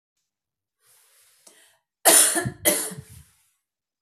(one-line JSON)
{"cough_length": "4.0 s", "cough_amplitude": 29321, "cough_signal_mean_std_ratio": 0.3, "survey_phase": "beta (2021-08-13 to 2022-03-07)", "age": "45-64", "gender": "Female", "wearing_mask": "No", "symptom_runny_or_blocked_nose": true, "symptom_sore_throat": true, "symptom_diarrhoea": true, "symptom_fatigue": true, "symptom_headache": true, "symptom_onset": "3 days", "smoker_status": "Never smoked", "respiratory_condition_asthma": false, "respiratory_condition_other": false, "recruitment_source": "Test and Trace", "submission_delay": "2 days", "covid_test_result": "Positive", "covid_test_method": "RT-qPCR", "covid_ct_value": 18.8, "covid_ct_gene": "ORF1ab gene", "covid_ct_mean": 19.2, "covid_viral_load": "510000 copies/ml", "covid_viral_load_category": "Low viral load (10K-1M copies/ml)"}